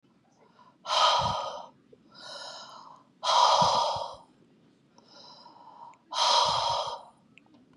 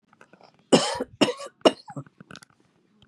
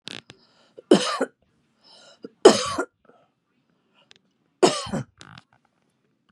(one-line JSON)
{"exhalation_length": "7.8 s", "exhalation_amplitude": 10470, "exhalation_signal_mean_std_ratio": 0.49, "cough_length": "3.1 s", "cough_amplitude": 26500, "cough_signal_mean_std_ratio": 0.28, "three_cough_length": "6.3 s", "three_cough_amplitude": 32290, "three_cough_signal_mean_std_ratio": 0.24, "survey_phase": "beta (2021-08-13 to 2022-03-07)", "age": "65+", "gender": "Female", "wearing_mask": "No", "symptom_none": true, "smoker_status": "Ex-smoker", "respiratory_condition_asthma": false, "respiratory_condition_other": false, "recruitment_source": "REACT", "submission_delay": "3 days", "covid_test_result": "Positive", "covid_test_method": "RT-qPCR", "covid_ct_value": 36.4, "covid_ct_gene": "N gene", "influenza_a_test_result": "Negative", "influenza_b_test_result": "Negative"}